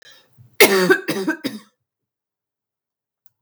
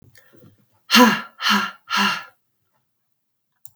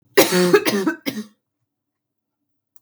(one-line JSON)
{"cough_length": "3.4 s", "cough_amplitude": 32768, "cough_signal_mean_std_ratio": 0.33, "exhalation_length": "3.8 s", "exhalation_amplitude": 32141, "exhalation_signal_mean_std_ratio": 0.36, "three_cough_length": "2.8 s", "three_cough_amplitude": 32768, "three_cough_signal_mean_std_ratio": 0.4, "survey_phase": "beta (2021-08-13 to 2022-03-07)", "age": "18-44", "gender": "Female", "wearing_mask": "No", "symptom_cough_any": true, "symptom_runny_or_blocked_nose": true, "symptom_sore_throat": true, "symptom_fatigue": true, "symptom_headache": true, "symptom_other": true, "symptom_onset": "4 days", "smoker_status": "Never smoked", "respiratory_condition_asthma": false, "respiratory_condition_other": false, "recruitment_source": "Test and Trace", "submission_delay": "1 day", "covid_test_result": "Negative", "covid_test_method": "RT-qPCR"}